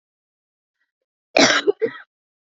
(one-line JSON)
{"cough_length": "2.6 s", "cough_amplitude": 28923, "cough_signal_mean_std_ratio": 0.3, "survey_phase": "beta (2021-08-13 to 2022-03-07)", "age": "18-44", "gender": "Female", "wearing_mask": "No", "symptom_runny_or_blocked_nose": true, "smoker_status": "Never smoked", "respiratory_condition_asthma": false, "respiratory_condition_other": false, "recruitment_source": "Test and Trace", "submission_delay": "2 days", "covid_test_result": "Positive", "covid_test_method": "RT-qPCR", "covid_ct_value": 22.6, "covid_ct_gene": "ORF1ab gene", "covid_ct_mean": 24.0, "covid_viral_load": "13000 copies/ml", "covid_viral_load_category": "Low viral load (10K-1M copies/ml)"}